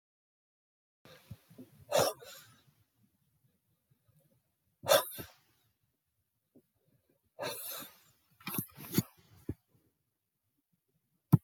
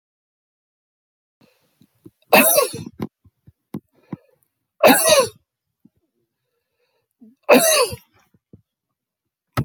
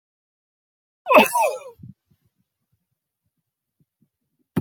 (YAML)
exhalation_length: 11.4 s
exhalation_amplitude: 11367
exhalation_signal_mean_std_ratio: 0.21
three_cough_length: 9.6 s
three_cough_amplitude: 32030
three_cough_signal_mean_std_ratio: 0.29
cough_length: 4.6 s
cough_amplitude: 27705
cough_signal_mean_std_ratio: 0.24
survey_phase: beta (2021-08-13 to 2022-03-07)
age: 65+
gender: Male
wearing_mask: 'No'
symptom_fatigue: true
symptom_fever_high_temperature: true
symptom_onset: 6 days
smoker_status: Never smoked
respiratory_condition_asthma: false
respiratory_condition_other: false
recruitment_source: REACT
submission_delay: 2 days
covid_test_result: Negative
covid_test_method: RT-qPCR